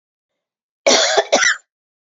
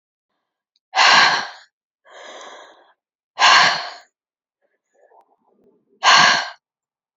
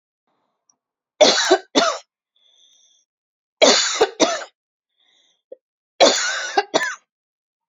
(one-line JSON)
{"cough_length": "2.1 s", "cough_amplitude": 31077, "cough_signal_mean_std_ratio": 0.43, "exhalation_length": "7.2 s", "exhalation_amplitude": 32767, "exhalation_signal_mean_std_ratio": 0.36, "three_cough_length": "7.7 s", "three_cough_amplitude": 29992, "three_cough_signal_mean_std_ratio": 0.37, "survey_phase": "beta (2021-08-13 to 2022-03-07)", "age": "45-64", "gender": "Female", "wearing_mask": "No", "symptom_cough_any": true, "symptom_runny_or_blocked_nose": true, "symptom_fatigue": true, "symptom_change_to_sense_of_smell_or_taste": true, "symptom_onset": "4 days", "smoker_status": "Never smoked", "respiratory_condition_asthma": false, "respiratory_condition_other": false, "recruitment_source": "Test and Trace", "submission_delay": "2 days", "covid_test_result": "Positive", "covid_test_method": "RT-qPCR", "covid_ct_value": 18.0, "covid_ct_gene": "ORF1ab gene", "covid_ct_mean": 18.4, "covid_viral_load": "890000 copies/ml", "covid_viral_load_category": "Low viral load (10K-1M copies/ml)"}